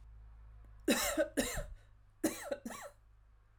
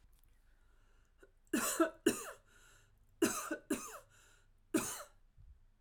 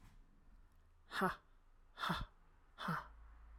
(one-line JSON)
{"cough_length": "3.6 s", "cough_amplitude": 4002, "cough_signal_mean_std_ratio": 0.49, "three_cough_length": "5.8 s", "three_cough_amplitude": 4498, "three_cough_signal_mean_std_ratio": 0.37, "exhalation_length": "3.6 s", "exhalation_amplitude": 2055, "exhalation_signal_mean_std_ratio": 0.46, "survey_phase": "alpha (2021-03-01 to 2021-08-12)", "age": "18-44", "gender": "Female", "wearing_mask": "No", "symptom_none": true, "smoker_status": "Ex-smoker", "respiratory_condition_asthma": false, "respiratory_condition_other": false, "recruitment_source": "REACT", "submission_delay": "1 day", "covid_test_result": "Negative", "covid_test_method": "RT-qPCR"}